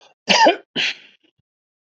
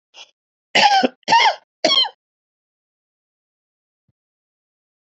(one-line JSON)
{"cough_length": "1.9 s", "cough_amplitude": 29658, "cough_signal_mean_std_ratio": 0.38, "three_cough_length": "5.0 s", "three_cough_amplitude": 29308, "three_cough_signal_mean_std_ratio": 0.33, "survey_phase": "beta (2021-08-13 to 2022-03-07)", "age": "45-64", "gender": "Male", "wearing_mask": "No", "symptom_none": true, "smoker_status": "Ex-smoker", "respiratory_condition_asthma": false, "respiratory_condition_other": false, "recruitment_source": "REACT", "submission_delay": "1 day", "covid_test_result": "Negative", "covid_test_method": "RT-qPCR", "influenza_a_test_result": "Unknown/Void", "influenza_b_test_result": "Unknown/Void"}